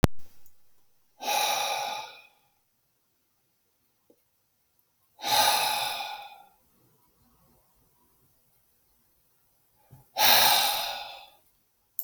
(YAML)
exhalation_length: 12.0 s
exhalation_amplitude: 25878
exhalation_signal_mean_std_ratio: 0.38
survey_phase: beta (2021-08-13 to 2022-03-07)
age: 65+
gender: Male
wearing_mask: 'No'
symptom_none: true
smoker_status: Never smoked
respiratory_condition_asthma: false
respiratory_condition_other: false
recruitment_source: REACT
submission_delay: 1 day
covid_test_result: Negative
covid_test_method: RT-qPCR